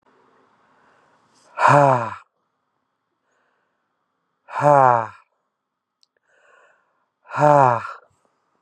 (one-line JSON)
{"exhalation_length": "8.6 s", "exhalation_amplitude": 31233, "exhalation_signal_mean_std_ratio": 0.3, "survey_phase": "beta (2021-08-13 to 2022-03-07)", "age": "18-44", "gender": "Male", "wearing_mask": "No", "symptom_runny_or_blocked_nose": true, "symptom_shortness_of_breath": true, "symptom_fatigue": true, "symptom_headache": true, "symptom_change_to_sense_of_smell_or_taste": true, "symptom_loss_of_taste": true, "smoker_status": "Ex-smoker", "respiratory_condition_asthma": false, "respiratory_condition_other": false, "recruitment_source": "Test and Trace", "submission_delay": "2 days", "covid_test_result": "Positive", "covid_test_method": "RT-qPCR", "covid_ct_value": 15.6, "covid_ct_gene": "ORF1ab gene", "covid_ct_mean": 15.6, "covid_viral_load": "7500000 copies/ml", "covid_viral_load_category": "High viral load (>1M copies/ml)"}